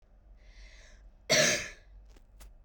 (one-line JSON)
{"cough_length": "2.6 s", "cough_amplitude": 8140, "cough_signal_mean_std_ratio": 0.37, "survey_phase": "beta (2021-08-13 to 2022-03-07)", "age": "18-44", "gender": "Female", "wearing_mask": "Yes", "symptom_none": true, "smoker_status": "Never smoked", "respiratory_condition_asthma": true, "respiratory_condition_other": false, "recruitment_source": "REACT", "submission_delay": "1 day", "covid_test_result": "Negative", "covid_test_method": "RT-qPCR", "influenza_a_test_result": "Negative", "influenza_b_test_result": "Negative"}